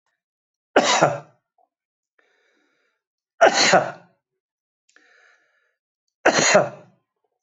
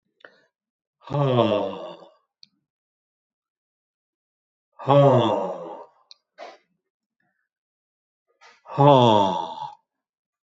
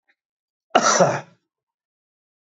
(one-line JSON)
{"three_cough_length": "7.4 s", "three_cough_amplitude": 26140, "three_cough_signal_mean_std_ratio": 0.32, "exhalation_length": "10.6 s", "exhalation_amplitude": 27402, "exhalation_signal_mean_std_ratio": 0.34, "cough_length": "2.6 s", "cough_amplitude": 25222, "cough_signal_mean_std_ratio": 0.31, "survey_phase": "alpha (2021-03-01 to 2021-08-12)", "age": "65+", "gender": "Male", "wearing_mask": "No", "symptom_none": true, "smoker_status": "Never smoked", "respiratory_condition_asthma": false, "respiratory_condition_other": false, "recruitment_source": "REACT", "submission_delay": "2 days", "covid_test_result": "Negative", "covid_test_method": "RT-qPCR"}